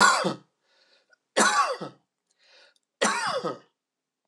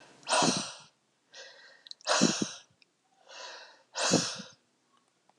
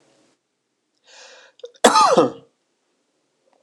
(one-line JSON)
{"three_cough_length": "4.3 s", "three_cough_amplitude": 15682, "three_cough_signal_mean_std_ratio": 0.42, "exhalation_length": "5.4 s", "exhalation_amplitude": 9415, "exhalation_signal_mean_std_ratio": 0.4, "cough_length": "3.6 s", "cough_amplitude": 26028, "cough_signal_mean_std_ratio": 0.29, "survey_phase": "alpha (2021-03-01 to 2021-08-12)", "age": "45-64", "gender": "Male", "wearing_mask": "No", "symptom_cough_any": true, "symptom_headache": true, "symptom_onset": "3 days", "smoker_status": "Ex-smoker", "respiratory_condition_asthma": false, "respiratory_condition_other": false, "recruitment_source": "Test and Trace", "submission_delay": "1 day", "covid_test_result": "Positive", "covid_test_method": "RT-qPCR"}